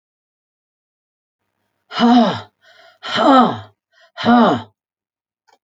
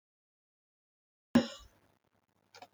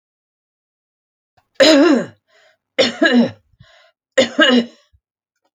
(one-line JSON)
{"exhalation_length": "5.6 s", "exhalation_amplitude": 31220, "exhalation_signal_mean_std_ratio": 0.39, "cough_length": "2.7 s", "cough_amplitude": 7603, "cough_signal_mean_std_ratio": 0.16, "three_cough_length": "5.5 s", "three_cough_amplitude": 29307, "three_cough_signal_mean_std_ratio": 0.4, "survey_phase": "alpha (2021-03-01 to 2021-08-12)", "age": "65+", "gender": "Female", "wearing_mask": "No", "symptom_none": true, "smoker_status": "Ex-smoker", "respiratory_condition_asthma": false, "respiratory_condition_other": false, "recruitment_source": "REACT", "submission_delay": "10 days", "covid_test_result": "Negative", "covid_test_method": "RT-qPCR"}